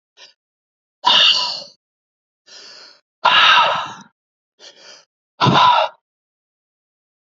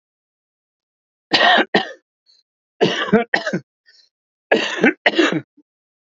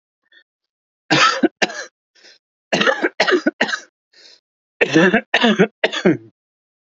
{
  "exhalation_length": "7.3 s",
  "exhalation_amplitude": 30200,
  "exhalation_signal_mean_std_ratio": 0.39,
  "cough_length": "6.1 s",
  "cough_amplitude": 32768,
  "cough_signal_mean_std_ratio": 0.4,
  "three_cough_length": "6.9 s",
  "three_cough_amplitude": 32767,
  "three_cough_signal_mean_std_ratio": 0.43,
  "survey_phase": "beta (2021-08-13 to 2022-03-07)",
  "age": "45-64",
  "gender": "Male",
  "wearing_mask": "No",
  "symptom_cough_any": true,
  "smoker_status": "Ex-smoker",
  "respiratory_condition_asthma": false,
  "respiratory_condition_other": true,
  "recruitment_source": "REACT",
  "submission_delay": "1 day",
  "covid_test_result": "Negative",
  "covid_test_method": "RT-qPCR"
}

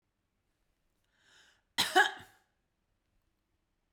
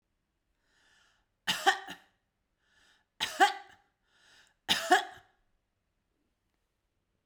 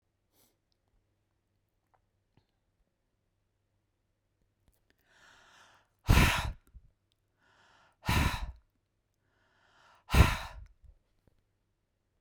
{
  "cough_length": "3.9 s",
  "cough_amplitude": 7787,
  "cough_signal_mean_std_ratio": 0.2,
  "three_cough_length": "7.3 s",
  "three_cough_amplitude": 11549,
  "three_cough_signal_mean_std_ratio": 0.24,
  "exhalation_length": "12.2 s",
  "exhalation_amplitude": 13620,
  "exhalation_signal_mean_std_ratio": 0.22,
  "survey_phase": "beta (2021-08-13 to 2022-03-07)",
  "age": "65+",
  "gender": "Female",
  "wearing_mask": "No",
  "symptom_none": true,
  "smoker_status": "Never smoked",
  "respiratory_condition_asthma": false,
  "respiratory_condition_other": false,
  "recruitment_source": "REACT",
  "submission_delay": "1 day",
  "covid_test_result": "Negative",
  "covid_test_method": "RT-qPCR"
}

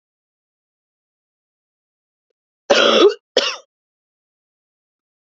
{
  "cough_length": "5.2 s",
  "cough_amplitude": 32768,
  "cough_signal_mean_std_ratio": 0.26,
  "survey_phase": "beta (2021-08-13 to 2022-03-07)",
  "age": "18-44",
  "gender": "Female",
  "wearing_mask": "No",
  "symptom_cough_any": true,
  "symptom_runny_or_blocked_nose": true,
  "symptom_sore_throat": true,
  "symptom_fatigue": true,
  "symptom_fever_high_temperature": true,
  "symptom_headache": true,
  "symptom_onset": "3 days",
  "smoker_status": "Never smoked",
  "respiratory_condition_asthma": false,
  "respiratory_condition_other": false,
  "recruitment_source": "Test and Trace",
  "submission_delay": "1 day",
  "covid_test_result": "Positive",
  "covid_test_method": "RT-qPCR",
  "covid_ct_value": 23.0,
  "covid_ct_gene": "ORF1ab gene"
}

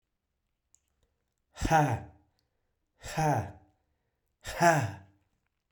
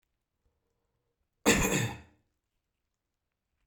{
  "exhalation_length": "5.7 s",
  "exhalation_amplitude": 10367,
  "exhalation_signal_mean_std_ratio": 0.35,
  "cough_length": "3.7 s",
  "cough_amplitude": 11663,
  "cough_signal_mean_std_ratio": 0.28,
  "survey_phase": "beta (2021-08-13 to 2022-03-07)",
  "age": "18-44",
  "gender": "Male",
  "wearing_mask": "No",
  "symptom_none": true,
  "smoker_status": "Never smoked",
  "respiratory_condition_asthma": true,
  "respiratory_condition_other": false,
  "recruitment_source": "REACT",
  "submission_delay": "1 day",
  "covid_test_result": "Negative",
  "covid_test_method": "RT-qPCR",
  "influenza_a_test_result": "Negative",
  "influenza_b_test_result": "Negative"
}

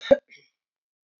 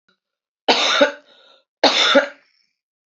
{
  "cough_length": "1.2 s",
  "cough_amplitude": 21762,
  "cough_signal_mean_std_ratio": 0.18,
  "three_cough_length": "3.2 s",
  "three_cough_amplitude": 32768,
  "three_cough_signal_mean_std_ratio": 0.42,
  "survey_phase": "alpha (2021-03-01 to 2021-08-12)",
  "age": "18-44",
  "gender": "Female",
  "wearing_mask": "No",
  "symptom_cough_any": true,
  "symptom_new_continuous_cough": true,
  "symptom_shortness_of_breath": true,
  "symptom_abdominal_pain": true,
  "symptom_diarrhoea": true,
  "symptom_fatigue": true,
  "symptom_fever_high_temperature": true,
  "symptom_headache": true,
  "symptom_onset": "4 days",
  "smoker_status": "Never smoked",
  "respiratory_condition_asthma": false,
  "respiratory_condition_other": false,
  "recruitment_source": "Test and Trace",
  "submission_delay": "2 days",
  "covid_test_result": "Positive",
  "covid_test_method": "RT-qPCR"
}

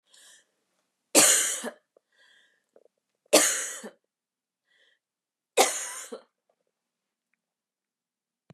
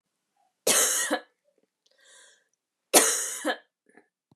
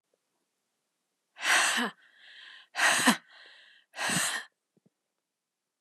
{
  "three_cough_length": "8.5 s",
  "three_cough_amplitude": 24608,
  "three_cough_signal_mean_std_ratio": 0.27,
  "cough_length": "4.4 s",
  "cough_amplitude": 25908,
  "cough_signal_mean_std_ratio": 0.36,
  "exhalation_length": "5.8 s",
  "exhalation_amplitude": 15758,
  "exhalation_signal_mean_std_ratio": 0.38,
  "survey_phase": "beta (2021-08-13 to 2022-03-07)",
  "age": "45-64",
  "gender": "Female",
  "wearing_mask": "No",
  "symptom_cough_any": true,
  "symptom_runny_or_blocked_nose": true,
  "symptom_shortness_of_breath": true,
  "symptom_sore_throat": true,
  "symptom_headache": true,
  "symptom_onset": "5 days",
  "smoker_status": "Never smoked",
  "respiratory_condition_asthma": true,
  "respiratory_condition_other": false,
  "recruitment_source": "Test and Trace",
  "submission_delay": "2 days",
  "covid_test_result": "Positive",
  "covid_test_method": "RT-qPCR",
  "covid_ct_value": 26.9,
  "covid_ct_gene": "N gene"
}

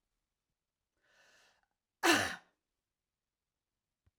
{
  "cough_length": "4.2 s",
  "cough_amplitude": 5965,
  "cough_signal_mean_std_ratio": 0.2,
  "survey_phase": "alpha (2021-03-01 to 2021-08-12)",
  "age": "45-64",
  "gender": "Female",
  "wearing_mask": "No",
  "symptom_none": true,
  "smoker_status": "Never smoked",
  "respiratory_condition_asthma": false,
  "respiratory_condition_other": false,
  "recruitment_source": "REACT",
  "submission_delay": "2 days",
  "covid_test_result": "Negative",
  "covid_test_method": "RT-qPCR"
}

